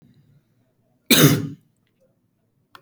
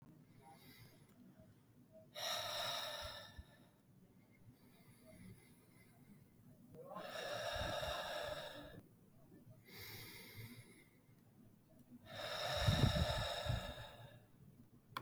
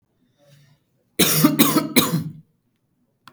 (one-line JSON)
{"cough_length": "2.8 s", "cough_amplitude": 32768, "cough_signal_mean_std_ratio": 0.27, "exhalation_length": "15.0 s", "exhalation_amplitude": 2793, "exhalation_signal_mean_std_ratio": 0.51, "three_cough_length": "3.3 s", "three_cough_amplitude": 32295, "three_cough_signal_mean_std_ratio": 0.42, "survey_phase": "beta (2021-08-13 to 2022-03-07)", "age": "18-44", "gender": "Male", "wearing_mask": "No", "symptom_none": true, "smoker_status": "Never smoked", "respiratory_condition_asthma": false, "respiratory_condition_other": false, "recruitment_source": "REACT", "submission_delay": "14 days", "covid_test_result": "Negative", "covid_test_method": "RT-qPCR", "influenza_a_test_result": "Negative", "influenza_b_test_result": "Negative"}